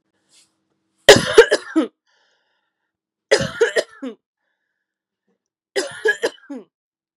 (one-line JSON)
{"three_cough_length": "7.2 s", "three_cough_amplitude": 32768, "three_cough_signal_mean_std_ratio": 0.27, "survey_phase": "beta (2021-08-13 to 2022-03-07)", "age": "18-44", "gender": "Female", "wearing_mask": "No", "symptom_none": true, "smoker_status": "Never smoked", "respiratory_condition_asthma": false, "respiratory_condition_other": false, "recruitment_source": "REACT", "submission_delay": "2 days", "covid_test_result": "Negative", "covid_test_method": "RT-qPCR"}